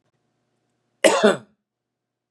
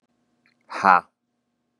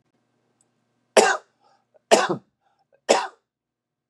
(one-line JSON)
{"cough_length": "2.3 s", "cough_amplitude": 29628, "cough_signal_mean_std_ratio": 0.27, "exhalation_length": "1.8 s", "exhalation_amplitude": 30139, "exhalation_signal_mean_std_ratio": 0.22, "three_cough_length": "4.1 s", "three_cough_amplitude": 30128, "three_cough_signal_mean_std_ratio": 0.27, "survey_phase": "beta (2021-08-13 to 2022-03-07)", "age": "45-64", "gender": "Male", "wearing_mask": "No", "symptom_none": true, "smoker_status": "Never smoked", "respiratory_condition_asthma": false, "respiratory_condition_other": false, "recruitment_source": "REACT", "submission_delay": "1 day", "covid_test_result": "Negative", "covid_test_method": "RT-qPCR", "influenza_a_test_result": "Negative", "influenza_b_test_result": "Negative"}